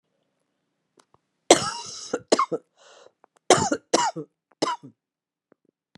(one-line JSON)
{"three_cough_length": "6.0 s", "three_cough_amplitude": 32767, "three_cough_signal_mean_std_ratio": 0.29, "survey_phase": "beta (2021-08-13 to 2022-03-07)", "age": "45-64", "gender": "Female", "wearing_mask": "No", "symptom_cough_any": true, "symptom_shortness_of_breath": true, "symptom_fatigue": true, "symptom_headache": true, "symptom_change_to_sense_of_smell_or_taste": true, "symptom_onset": "4 days", "smoker_status": "Ex-smoker", "respiratory_condition_asthma": false, "respiratory_condition_other": false, "recruitment_source": "Test and Trace", "submission_delay": "1 day", "covid_test_result": "Positive", "covid_test_method": "ePCR"}